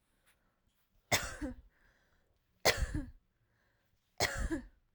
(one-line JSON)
{"three_cough_length": "4.9 s", "three_cough_amplitude": 7125, "three_cough_signal_mean_std_ratio": 0.35, "survey_phase": "alpha (2021-03-01 to 2021-08-12)", "age": "18-44", "gender": "Female", "wearing_mask": "No", "symptom_none": true, "smoker_status": "Never smoked", "respiratory_condition_asthma": false, "respiratory_condition_other": false, "recruitment_source": "REACT", "submission_delay": "2 days", "covid_test_result": "Negative", "covid_test_method": "RT-qPCR"}